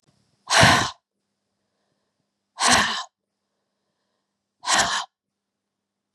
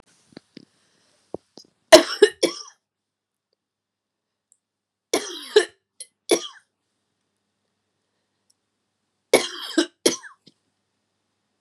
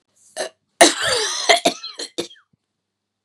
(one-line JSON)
{"exhalation_length": "6.1 s", "exhalation_amplitude": 28575, "exhalation_signal_mean_std_ratio": 0.33, "three_cough_length": "11.6 s", "three_cough_amplitude": 32768, "three_cough_signal_mean_std_ratio": 0.19, "cough_length": "3.2 s", "cough_amplitude": 32768, "cough_signal_mean_std_ratio": 0.38, "survey_phase": "beta (2021-08-13 to 2022-03-07)", "age": "45-64", "gender": "Female", "wearing_mask": "No", "symptom_none": true, "symptom_onset": "12 days", "smoker_status": "Ex-smoker", "respiratory_condition_asthma": false, "respiratory_condition_other": false, "recruitment_source": "REACT", "submission_delay": "2 days", "covid_test_result": "Negative", "covid_test_method": "RT-qPCR", "influenza_a_test_result": "Negative", "influenza_b_test_result": "Negative"}